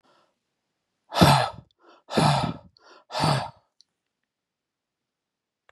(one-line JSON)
{"exhalation_length": "5.7 s", "exhalation_amplitude": 23282, "exhalation_signal_mean_std_ratio": 0.33, "survey_phase": "beta (2021-08-13 to 2022-03-07)", "age": "45-64", "gender": "Male", "wearing_mask": "No", "symptom_none": true, "smoker_status": "Ex-smoker", "respiratory_condition_asthma": false, "respiratory_condition_other": false, "recruitment_source": "REACT", "submission_delay": "1 day", "covid_test_result": "Negative", "covid_test_method": "RT-qPCR", "influenza_a_test_result": "Negative", "influenza_b_test_result": "Negative"}